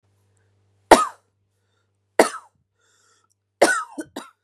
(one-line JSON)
{"three_cough_length": "4.4 s", "three_cough_amplitude": 32768, "three_cough_signal_mean_std_ratio": 0.22, "survey_phase": "beta (2021-08-13 to 2022-03-07)", "age": "18-44", "gender": "Female", "wearing_mask": "No", "symptom_cough_any": true, "symptom_new_continuous_cough": true, "symptom_runny_or_blocked_nose": true, "symptom_shortness_of_breath": true, "symptom_sore_throat": true, "symptom_fatigue": true, "symptom_fever_high_temperature": true, "symptom_headache": true, "symptom_other": true, "symptom_onset": "2 days", "smoker_status": "Never smoked", "respiratory_condition_asthma": false, "respiratory_condition_other": false, "recruitment_source": "Test and Trace", "submission_delay": "1 day", "covid_test_result": "Negative", "covid_test_method": "RT-qPCR"}